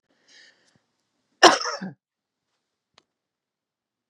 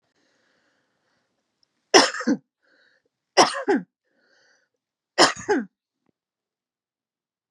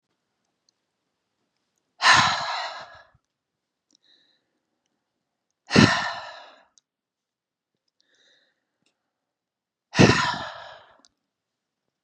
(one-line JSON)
{"cough_length": "4.1 s", "cough_amplitude": 32714, "cough_signal_mean_std_ratio": 0.17, "three_cough_length": "7.5 s", "three_cough_amplitude": 32767, "three_cough_signal_mean_std_ratio": 0.25, "exhalation_length": "12.0 s", "exhalation_amplitude": 28492, "exhalation_signal_mean_std_ratio": 0.25, "survey_phase": "beta (2021-08-13 to 2022-03-07)", "age": "65+", "gender": "Female", "wearing_mask": "No", "symptom_none": true, "smoker_status": "Never smoked", "respiratory_condition_asthma": false, "respiratory_condition_other": false, "recruitment_source": "Test and Trace", "submission_delay": "1 day", "covid_test_result": "Negative", "covid_test_method": "RT-qPCR"}